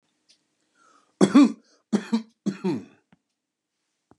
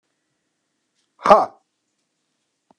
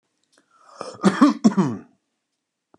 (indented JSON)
{
  "three_cough_length": "4.2 s",
  "three_cough_amplitude": 29742,
  "three_cough_signal_mean_std_ratio": 0.28,
  "exhalation_length": "2.8 s",
  "exhalation_amplitude": 32768,
  "exhalation_signal_mean_std_ratio": 0.19,
  "cough_length": "2.8 s",
  "cough_amplitude": 29467,
  "cough_signal_mean_std_ratio": 0.34,
  "survey_phase": "beta (2021-08-13 to 2022-03-07)",
  "age": "45-64",
  "gender": "Male",
  "wearing_mask": "No",
  "symptom_none": true,
  "smoker_status": "Ex-smoker",
  "respiratory_condition_asthma": false,
  "respiratory_condition_other": false,
  "recruitment_source": "REACT",
  "submission_delay": "0 days",
  "covid_test_result": "Negative",
  "covid_test_method": "RT-qPCR"
}